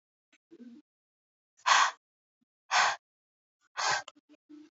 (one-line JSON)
{"exhalation_length": "4.8 s", "exhalation_amplitude": 12058, "exhalation_signal_mean_std_ratio": 0.31, "survey_phase": "beta (2021-08-13 to 2022-03-07)", "age": "18-44", "gender": "Female", "wearing_mask": "No", "symptom_cough_any": true, "symptom_new_continuous_cough": true, "symptom_runny_or_blocked_nose": true, "symptom_shortness_of_breath": true, "symptom_fatigue": true, "symptom_headache": true, "symptom_onset": "2 days", "smoker_status": "Never smoked", "respiratory_condition_asthma": false, "respiratory_condition_other": false, "recruitment_source": "Test and Trace", "submission_delay": "1 day", "covid_test_result": "Positive", "covid_test_method": "RT-qPCR", "covid_ct_value": 19.9, "covid_ct_gene": "ORF1ab gene", "covid_ct_mean": 20.5, "covid_viral_load": "180000 copies/ml", "covid_viral_load_category": "Low viral load (10K-1M copies/ml)"}